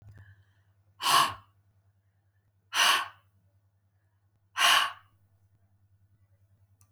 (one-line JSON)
{"exhalation_length": "6.9 s", "exhalation_amplitude": 14234, "exhalation_signal_mean_std_ratio": 0.3, "survey_phase": "alpha (2021-03-01 to 2021-08-12)", "age": "65+", "gender": "Female", "wearing_mask": "No", "symptom_none": true, "smoker_status": "Never smoked", "respiratory_condition_asthma": false, "respiratory_condition_other": false, "recruitment_source": "REACT", "submission_delay": "2 days", "covid_test_result": "Negative", "covid_test_method": "RT-qPCR"}